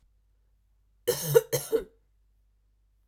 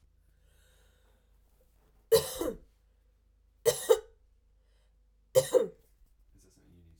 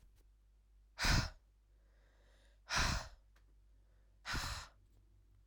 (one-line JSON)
{"cough_length": "3.1 s", "cough_amplitude": 17577, "cough_signal_mean_std_ratio": 0.28, "three_cough_length": "7.0 s", "three_cough_amplitude": 10593, "three_cough_signal_mean_std_ratio": 0.25, "exhalation_length": "5.5 s", "exhalation_amplitude": 2913, "exhalation_signal_mean_std_ratio": 0.37, "survey_phase": "alpha (2021-03-01 to 2021-08-12)", "age": "18-44", "gender": "Female", "wearing_mask": "No", "symptom_cough_any": true, "symptom_headache": true, "symptom_onset": "3 days", "smoker_status": "Ex-smoker", "respiratory_condition_asthma": false, "respiratory_condition_other": false, "recruitment_source": "REACT", "submission_delay": "31 days", "covid_test_result": "Negative", "covid_test_method": "RT-qPCR"}